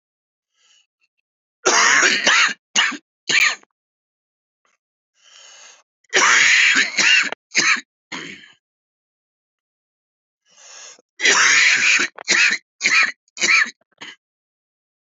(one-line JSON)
{"three_cough_length": "15.2 s", "three_cough_amplitude": 29785, "three_cough_signal_mean_std_ratio": 0.46, "survey_phase": "beta (2021-08-13 to 2022-03-07)", "age": "45-64", "gender": "Male", "wearing_mask": "No", "symptom_cough_any": true, "symptom_new_continuous_cough": true, "symptom_runny_or_blocked_nose": true, "symptom_shortness_of_breath": true, "symptom_sore_throat": true, "symptom_abdominal_pain": true, "symptom_diarrhoea": true, "symptom_fatigue": true, "symptom_fever_high_temperature": true, "symptom_headache": true, "symptom_change_to_sense_of_smell_or_taste": true, "symptom_loss_of_taste": true, "symptom_other": true, "symptom_onset": "5 days", "smoker_status": "Ex-smoker", "respiratory_condition_asthma": false, "respiratory_condition_other": false, "recruitment_source": "REACT", "submission_delay": "2 days", "covid_test_result": "Positive", "covid_test_method": "RT-qPCR", "covid_ct_value": 22.0, "covid_ct_gene": "N gene", "influenza_a_test_result": "Negative", "influenza_b_test_result": "Negative"}